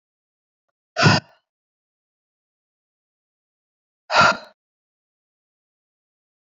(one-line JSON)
{"exhalation_length": "6.5 s", "exhalation_amplitude": 26846, "exhalation_signal_mean_std_ratio": 0.21, "survey_phase": "beta (2021-08-13 to 2022-03-07)", "age": "45-64", "gender": "Female", "wearing_mask": "Yes", "symptom_cough_any": true, "symptom_new_continuous_cough": true, "symptom_sore_throat": true, "symptom_headache": true, "symptom_change_to_sense_of_smell_or_taste": true, "symptom_loss_of_taste": true, "symptom_onset": "4 days", "smoker_status": "Ex-smoker", "respiratory_condition_asthma": false, "respiratory_condition_other": false, "recruitment_source": "Test and Trace", "submission_delay": "2 days", "covid_test_result": "Positive", "covid_test_method": "RT-qPCR", "covid_ct_value": 18.3, "covid_ct_gene": "ORF1ab gene"}